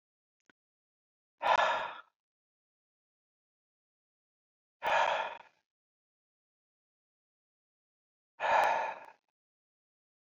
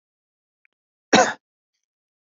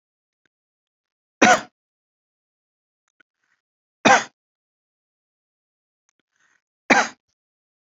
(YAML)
exhalation_length: 10.3 s
exhalation_amplitude: 6348
exhalation_signal_mean_std_ratio: 0.29
cough_length: 2.4 s
cough_amplitude: 28334
cough_signal_mean_std_ratio: 0.2
three_cough_length: 7.9 s
three_cough_amplitude: 32267
three_cough_signal_mean_std_ratio: 0.19
survey_phase: beta (2021-08-13 to 2022-03-07)
age: 45-64
gender: Male
wearing_mask: 'No'
symptom_none: true
smoker_status: Never smoked
respiratory_condition_asthma: false
respiratory_condition_other: false
recruitment_source: REACT
submission_delay: 2 days
covid_test_result: Negative
covid_test_method: RT-qPCR
influenza_a_test_result: Negative
influenza_b_test_result: Negative